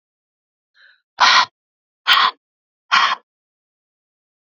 exhalation_length: 4.4 s
exhalation_amplitude: 32768
exhalation_signal_mean_std_ratio: 0.32
survey_phase: alpha (2021-03-01 to 2021-08-12)
age: 18-44
gender: Female
wearing_mask: 'No'
symptom_none: true
symptom_onset: 6 days
smoker_status: Ex-smoker
respiratory_condition_asthma: false
respiratory_condition_other: false
recruitment_source: REACT
submission_delay: 1 day
covid_test_result: Negative
covid_test_method: RT-qPCR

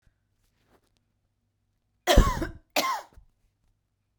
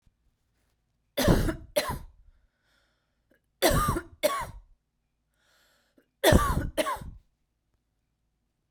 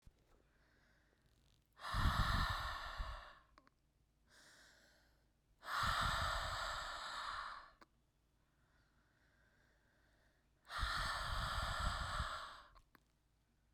cough_length: 4.2 s
cough_amplitude: 20298
cough_signal_mean_std_ratio: 0.26
three_cough_length: 8.7 s
three_cough_amplitude: 22472
three_cough_signal_mean_std_ratio: 0.35
exhalation_length: 13.7 s
exhalation_amplitude: 2220
exhalation_signal_mean_std_ratio: 0.52
survey_phase: beta (2021-08-13 to 2022-03-07)
age: 45-64
gender: Female
wearing_mask: 'No'
symptom_abdominal_pain: true
symptom_fatigue: true
symptom_headache: true
symptom_other: true
smoker_status: Ex-smoker
respiratory_condition_asthma: false
respiratory_condition_other: false
recruitment_source: Test and Trace
submission_delay: 1 day
covid_test_result: Positive
covid_test_method: RT-qPCR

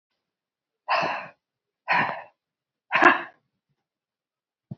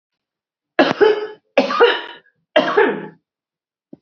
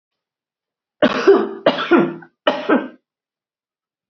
exhalation_length: 4.8 s
exhalation_amplitude: 27546
exhalation_signal_mean_std_ratio: 0.31
three_cough_length: 4.0 s
three_cough_amplitude: 30529
three_cough_signal_mean_std_ratio: 0.43
cough_length: 4.1 s
cough_amplitude: 28034
cough_signal_mean_std_ratio: 0.41
survey_phase: alpha (2021-03-01 to 2021-08-12)
age: 65+
gender: Female
wearing_mask: 'No'
symptom_none: true
smoker_status: Ex-smoker
respiratory_condition_asthma: true
respiratory_condition_other: false
recruitment_source: REACT
submission_delay: 2 days
covid_test_result: Negative
covid_test_method: RT-qPCR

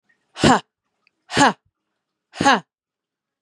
exhalation_length: 3.4 s
exhalation_amplitude: 30403
exhalation_signal_mean_std_ratio: 0.3
survey_phase: beta (2021-08-13 to 2022-03-07)
age: 18-44
gender: Female
wearing_mask: 'No'
symptom_fatigue: true
symptom_headache: true
symptom_onset: 12 days
smoker_status: Ex-smoker
respiratory_condition_asthma: false
respiratory_condition_other: false
recruitment_source: REACT
submission_delay: 1 day
covid_test_result: Negative
covid_test_method: RT-qPCR
influenza_a_test_result: Negative
influenza_b_test_result: Negative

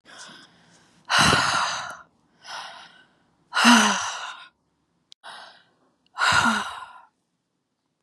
exhalation_length: 8.0 s
exhalation_amplitude: 28913
exhalation_signal_mean_std_ratio: 0.4
survey_phase: beta (2021-08-13 to 2022-03-07)
age: 18-44
gender: Female
wearing_mask: 'No'
symptom_sore_throat: true
symptom_fatigue: true
symptom_headache: true
symptom_change_to_sense_of_smell_or_taste: true
smoker_status: Ex-smoker
respiratory_condition_asthma: false
respiratory_condition_other: false
recruitment_source: Test and Trace
submission_delay: 1 day
covid_test_result: Positive
covid_test_method: LFT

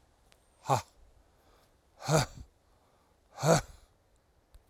exhalation_length: 4.7 s
exhalation_amplitude: 10400
exhalation_signal_mean_std_ratio: 0.29
survey_phase: alpha (2021-03-01 to 2021-08-12)
age: 65+
gender: Male
wearing_mask: 'No'
symptom_none: true
smoker_status: Never smoked
respiratory_condition_asthma: false
respiratory_condition_other: false
recruitment_source: REACT
submission_delay: 1 day
covid_test_result: Negative
covid_test_method: RT-qPCR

